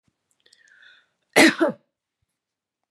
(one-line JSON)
{"cough_length": "2.9 s", "cough_amplitude": 28279, "cough_signal_mean_std_ratio": 0.24, "survey_phase": "beta (2021-08-13 to 2022-03-07)", "age": "65+", "gender": "Female", "wearing_mask": "No", "symptom_none": true, "smoker_status": "Never smoked", "respiratory_condition_asthma": false, "respiratory_condition_other": false, "recruitment_source": "REACT", "submission_delay": "2 days", "covid_test_result": "Negative", "covid_test_method": "RT-qPCR", "influenza_a_test_result": "Negative", "influenza_b_test_result": "Negative"}